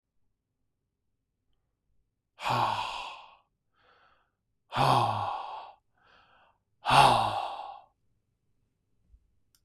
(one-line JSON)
{"exhalation_length": "9.6 s", "exhalation_amplitude": 15758, "exhalation_signal_mean_std_ratio": 0.34, "survey_phase": "beta (2021-08-13 to 2022-03-07)", "age": "45-64", "gender": "Male", "wearing_mask": "No", "symptom_none": true, "smoker_status": "Ex-smoker", "respiratory_condition_asthma": false, "respiratory_condition_other": false, "recruitment_source": "REACT", "submission_delay": "2 days", "covid_test_result": "Negative", "covid_test_method": "RT-qPCR", "influenza_a_test_result": "Negative", "influenza_b_test_result": "Negative"}